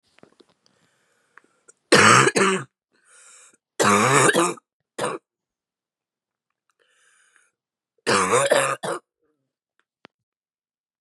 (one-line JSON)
{"three_cough_length": "11.0 s", "three_cough_amplitude": 31082, "three_cough_signal_mean_std_ratio": 0.35, "survey_phase": "beta (2021-08-13 to 2022-03-07)", "age": "18-44", "gender": "Female", "wearing_mask": "No", "symptom_cough_any": true, "symptom_runny_or_blocked_nose": true, "symptom_shortness_of_breath": true, "symptom_fatigue": true, "symptom_headache": true, "symptom_change_to_sense_of_smell_or_taste": true, "symptom_loss_of_taste": true, "symptom_onset": "3 days", "smoker_status": "Never smoked", "respiratory_condition_asthma": true, "respiratory_condition_other": false, "recruitment_source": "Test and Trace", "submission_delay": "1 day", "covid_test_result": "Positive", "covid_test_method": "ePCR"}